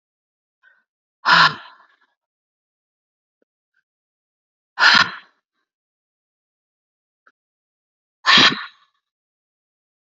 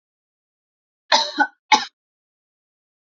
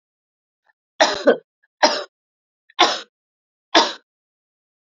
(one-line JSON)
{"exhalation_length": "10.2 s", "exhalation_amplitude": 32768, "exhalation_signal_mean_std_ratio": 0.23, "cough_length": "3.2 s", "cough_amplitude": 28849, "cough_signal_mean_std_ratio": 0.25, "three_cough_length": "4.9 s", "three_cough_amplitude": 30241, "three_cough_signal_mean_std_ratio": 0.29, "survey_phase": "beta (2021-08-13 to 2022-03-07)", "age": "45-64", "gender": "Female", "wearing_mask": "No", "symptom_none": true, "smoker_status": "Never smoked", "respiratory_condition_asthma": false, "respiratory_condition_other": false, "recruitment_source": "REACT", "submission_delay": "1 day", "covid_test_result": "Negative", "covid_test_method": "RT-qPCR"}